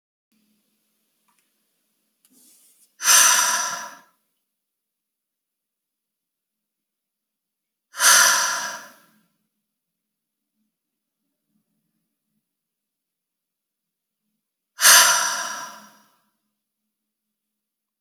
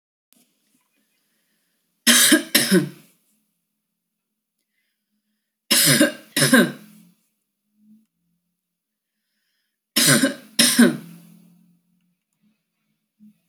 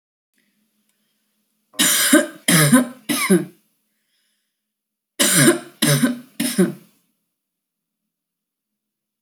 {"exhalation_length": "18.0 s", "exhalation_amplitude": 31308, "exhalation_signal_mean_std_ratio": 0.25, "three_cough_length": "13.5 s", "three_cough_amplitude": 30283, "three_cough_signal_mean_std_ratio": 0.32, "cough_length": "9.2 s", "cough_amplitude": 30648, "cough_signal_mean_std_ratio": 0.39, "survey_phase": "alpha (2021-03-01 to 2021-08-12)", "age": "45-64", "gender": "Female", "wearing_mask": "No", "symptom_none": true, "smoker_status": "Ex-smoker", "respiratory_condition_asthma": false, "respiratory_condition_other": false, "recruitment_source": "REACT", "submission_delay": "1 day", "covid_test_result": "Negative", "covid_test_method": "RT-qPCR"}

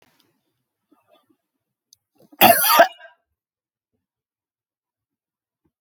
{"cough_length": "5.8 s", "cough_amplitude": 32768, "cough_signal_mean_std_ratio": 0.21, "survey_phase": "alpha (2021-03-01 to 2021-08-12)", "age": "65+", "gender": "Male", "wearing_mask": "No", "symptom_none": true, "smoker_status": "Never smoked", "respiratory_condition_asthma": false, "respiratory_condition_other": false, "recruitment_source": "REACT", "submission_delay": "2 days", "covid_test_result": "Negative", "covid_test_method": "RT-qPCR"}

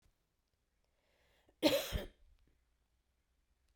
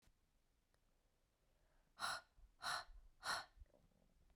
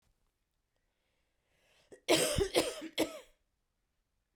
{"cough_length": "3.8 s", "cough_amplitude": 5547, "cough_signal_mean_std_ratio": 0.24, "exhalation_length": "4.4 s", "exhalation_amplitude": 905, "exhalation_signal_mean_std_ratio": 0.37, "three_cough_length": "4.4 s", "three_cough_amplitude": 6874, "three_cough_signal_mean_std_ratio": 0.33, "survey_phase": "beta (2021-08-13 to 2022-03-07)", "age": "45-64", "gender": "Female", "wearing_mask": "No", "symptom_cough_any": true, "symptom_runny_or_blocked_nose": true, "symptom_fatigue": true, "symptom_headache": true, "smoker_status": "Never smoked", "respiratory_condition_asthma": false, "respiratory_condition_other": false, "recruitment_source": "Test and Trace", "submission_delay": "2 days", "covid_test_result": "Positive", "covid_test_method": "RT-qPCR", "covid_ct_value": 13.9, "covid_ct_gene": "ORF1ab gene", "covid_ct_mean": 16.6, "covid_viral_load": "3500000 copies/ml", "covid_viral_load_category": "High viral load (>1M copies/ml)"}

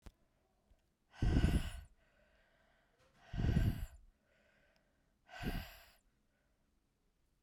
{"exhalation_length": "7.4 s", "exhalation_amplitude": 3895, "exhalation_signal_mean_std_ratio": 0.34, "survey_phase": "alpha (2021-03-01 to 2021-08-12)", "age": "18-44", "gender": "Female", "wearing_mask": "No", "symptom_cough_any": true, "symptom_shortness_of_breath": true, "symptom_fatigue": true, "symptom_change_to_sense_of_smell_or_taste": true, "symptom_loss_of_taste": true, "symptom_onset": "4 days", "smoker_status": "Current smoker (1 to 10 cigarettes per day)", "respiratory_condition_asthma": true, "respiratory_condition_other": false, "recruitment_source": "Test and Trace", "submission_delay": "1 day", "covid_test_result": "Positive", "covid_test_method": "RT-qPCR", "covid_ct_value": 23.0, "covid_ct_gene": "ORF1ab gene"}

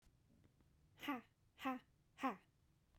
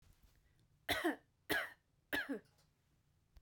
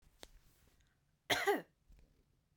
{"exhalation_length": "3.0 s", "exhalation_amplitude": 1117, "exhalation_signal_mean_std_ratio": 0.36, "three_cough_length": "3.4 s", "three_cough_amplitude": 2699, "three_cough_signal_mean_std_ratio": 0.38, "cough_length": "2.6 s", "cough_amplitude": 3340, "cough_signal_mean_std_ratio": 0.29, "survey_phase": "beta (2021-08-13 to 2022-03-07)", "age": "18-44", "gender": "Female", "wearing_mask": "No", "symptom_sore_throat": true, "smoker_status": "Never smoked", "respiratory_condition_asthma": false, "respiratory_condition_other": false, "recruitment_source": "REACT", "submission_delay": "2 days", "covid_test_result": "Negative", "covid_test_method": "RT-qPCR", "influenza_a_test_result": "Negative", "influenza_b_test_result": "Negative"}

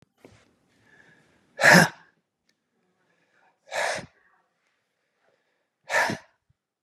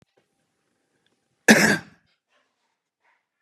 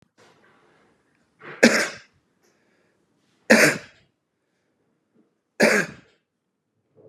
{"exhalation_length": "6.8 s", "exhalation_amplitude": 27463, "exhalation_signal_mean_std_ratio": 0.23, "cough_length": "3.4 s", "cough_amplitude": 31254, "cough_signal_mean_std_ratio": 0.22, "three_cough_length": "7.1 s", "three_cough_amplitude": 32471, "three_cough_signal_mean_std_ratio": 0.25, "survey_phase": "beta (2021-08-13 to 2022-03-07)", "age": "45-64", "gender": "Male", "wearing_mask": "No", "symptom_runny_or_blocked_nose": true, "symptom_change_to_sense_of_smell_or_taste": true, "smoker_status": "Ex-smoker", "respiratory_condition_asthma": false, "respiratory_condition_other": false, "recruitment_source": "Test and Trace", "submission_delay": "2 days", "covid_test_result": "Positive", "covid_test_method": "RT-qPCR", "covid_ct_value": 20.1, "covid_ct_gene": "ORF1ab gene", "covid_ct_mean": 20.4, "covid_viral_load": "210000 copies/ml", "covid_viral_load_category": "Low viral load (10K-1M copies/ml)"}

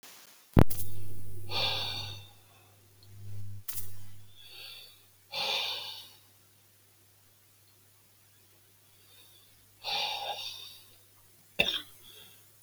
{"exhalation_length": "12.6 s", "exhalation_amplitude": 24604, "exhalation_signal_mean_std_ratio": 0.44, "survey_phase": "beta (2021-08-13 to 2022-03-07)", "age": "65+", "gender": "Male", "wearing_mask": "No", "symptom_none": true, "smoker_status": "Ex-smoker", "respiratory_condition_asthma": false, "respiratory_condition_other": false, "recruitment_source": "REACT", "submission_delay": "1 day", "covid_test_result": "Negative", "covid_test_method": "RT-qPCR"}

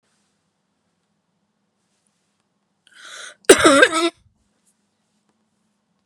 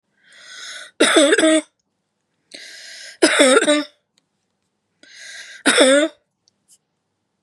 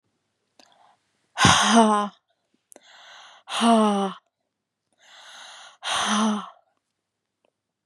{"cough_length": "6.1 s", "cough_amplitude": 32768, "cough_signal_mean_std_ratio": 0.23, "three_cough_length": "7.4 s", "three_cough_amplitude": 32708, "three_cough_signal_mean_std_ratio": 0.41, "exhalation_length": "7.9 s", "exhalation_amplitude": 27806, "exhalation_signal_mean_std_ratio": 0.39, "survey_phase": "beta (2021-08-13 to 2022-03-07)", "age": "45-64", "gender": "Female", "wearing_mask": "No", "symptom_cough_any": true, "symptom_runny_or_blocked_nose": true, "symptom_sore_throat": true, "symptom_headache": true, "smoker_status": "Never smoked", "respiratory_condition_asthma": false, "respiratory_condition_other": false, "recruitment_source": "Test and Trace", "submission_delay": "2 days", "covid_test_result": "Positive", "covid_test_method": "LFT"}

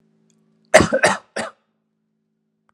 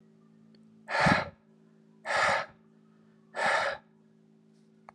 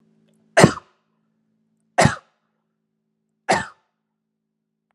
{"cough_length": "2.7 s", "cough_amplitude": 32768, "cough_signal_mean_std_ratio": 0.28, "exhalation_length": "4.9 s", "exhalation_amplitude": 9328, "exhalation_signal_mean_std_ratio": 0.41, "three_cough_length": "4.9 s", "three_cough_amplitude": 32768, "three_cough_signal_mean_std_ratio": 0.21, "survey_phase": "beta (2021-08-13 to 2022-03-07)", "age": "18-44", "gender": "Male", "wearing_mask": "No", "symptom_none": true, "smoker_status": "Never smoked", "respiratory_condition_asthma": false, "respiratory_condition_other": false, "recruitment_source": "REACT", "submission_delay": "0 days", "covid_test_result": "Negative", "covid_test_method": "RT-qPCR"}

